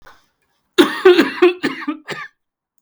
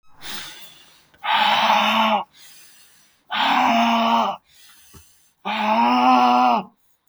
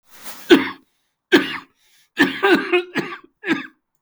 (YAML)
cough_length: 2.8 s
cough_amplitude: 32768
cough_signal_mean_std_ratio: 0.41
exhalation_length: 7.1 s
exhalation_amplitude: 20230
exhalation_signal_mean_std_ratio: 0.65
three_cough_length: 4.0 s
three_cough_amplitude: 32768
three_cough_signal_mean_std_ratio: 0.41
survey_phase: beta (2021-08-13 to 2022-03-07)
age: 45-64
gender: Male
wearing_mask: 'Yes'
symptom_cough_any: true
symptom_runny_or_blocked_nose: true
symptom_fatigue: true
smoker_status: Never smoked
respiratory_condition_asthma: false
respiratory_condition_other: false
recruitment_source: Test and Trace
submission_delay: 2 days
covid_test_result: Positive
covid_test_method: RT-qPCR
covid_ct_value: 21.2
covid_ct_gene: ORF1ab gene
covid_ct_mean: 22.2
covid_viral_load: 54000 copies/ml
covid_viral_load_category: Low viral load (10K-1M copies/ml)